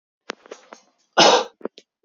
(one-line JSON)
{"cough_length": "2.0 s", "cough_amplitude": 31758, "cough_signal_mean_std_ratio": 0.3, "survey_phase": "beta (2021-08-13 to 2022-03-07)", "age": "18-44", "gender": "Male", "wearing_mask": "No", "symptom_change_to_sense_of_smell_or_taste": true, "symptom_loss_of_taste": true, "symptom_onset": "3 days", "smoker_status": "Never smoked", "respiratory_condition_asthma": false, "respiratory_condition_other": false, "recruitment_source": "Test and Trace", "submission_delay": "2 days", "covid_test_result": "Positive", "covid_test_method": "RT-qPCR", "covid_ct_value": 18.4, "covid_ct_gene": "ORF1ab gene"}